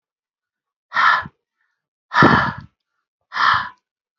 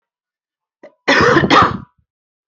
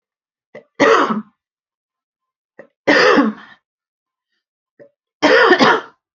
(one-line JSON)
{"exhalation_length": "4.2 s", "exhalation_amplitude": 29535, "exhalation_signal_mean_std_ratio": 0.38, "cough_length": "2.5 s", "cough_amplitude": 30207, "cough_signal_mean_std_ratio": 0.43, "three_cough_length": "6.1 s", "three_cough_amplitude": 32768, "three_cough_signal_mean_std_ratio": 0.4, "survey_phase": "beta (2021-08-13 to 2022-03-07)", "age": "18-44", "gender": "Female", "wearing_mask": "No", "symptom_cough_any": true, "symptom_runny_or_blocked_nose": true, "symptom_abdominal_pain": true, "symptom_fatigue": true, "symptom_onset": "12 days", "smoker_status": "Ex-smoker", "respiratory_condition_asthma": false, "respiratory_condition_other": false, "recruitment_source": "REACT", "submission_delay": "1 day", "covid_test_result": "Negative", "covid_test_method": "RT-qPCR", "influenza_a_test_result": "Negative", "influenza_b_test_result": "Negative"}